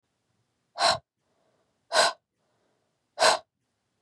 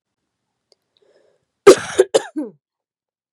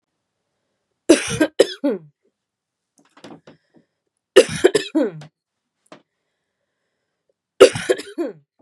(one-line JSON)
{"exhalation_length": "4.0 s", "exhalation_amplitude": 14723, "exhalation_signal_mean_std_ratio": 0.29, "cough_length": "3.3 s", "cough_amplitude": 32768, "cough_signal_mean_std_ratio": 0.21, "three_cough_length": "8.6 s", "three_cough_amplitude": 32768, "three_cough_signal_mean_std_ratio": 0.26, "survey_phase": "beta (2021-08-13 to 2022-03-07)", "age": "18-44", "gender": "Female", "wearing_mask": "No", "symptom_cough_any": true, "symptom_new_continuous_cough": true, "symptom_runny_or_blocked_nose": true, "symptom_sore_throat": true, "symptom_fatigue": true, "symptom_fever_high_temperature": true, "symptom_headache": true, "smoker_status": "Never smoked", "respiratory_condition_asthma": false, "respiratory_condition_other": false, "recruitment_source": "Test and Trace", "submission_delay": "1 day", "covid_test_result": "Positive", "covid_test_method": "RT-qPCR", "covid_ct_value": 28.1, "covid_ct_gene": "ORF1ab gene", "covid_ct_mean": 28.6, "covid_viral_load": "430 copies/ml", "covid_viral_load_category": "Minimal viral load (< 10K copies/ml)"}